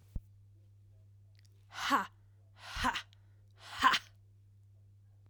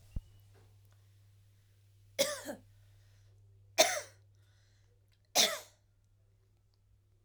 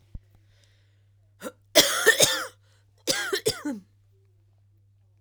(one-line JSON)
{"exhalation_length": "5.3 s", "exhalation_amplitude": 7567, "exhalation_signal_mean_std_ratio": 0.34, "three_cough_length": "7.2 s", "three_cough_amplitude": 10743, "three_cough_signal_mean_std_ratio": 0.26, "cough_length": "5.2 s", "cough_amplitude": 30777, "cough_signal_mean_std_ratio": 0.34, "survey_phase": "beta (2021-08-13 to 2022-03-07)", "age": "18-44", "gender": "Female", "wearing_mask": "No", "symptom_cough_any": true, "symptom_new_continuous_cough": true, "symptom_sore_throat": true, "symptom_diarrhoea": true, "symptom_fatigue": true, "symptom_change_to_sense_of_smell_or_taste": true, "symptom_loss_of_taste": true, "symptom_onset": "4 days", "smoker_status": "Never smoked", "respiratory_condition_asthma": false, "respiratory_condition_other": false, "recruitment_source": "Test and Trace", "submission_delay": "2 days", "covid_test_result": "Positive", "covid_test_method": "RT-qPCR", "covid_ct_value": 20.8, "covid_ct_gene": "ORF1ab gene", "covid_ct_mean": 21.5, "covid_viral_load": "90000 copies/ml", "covid_viral_load_category": "Low viral load (10K-1M copies/ml)"}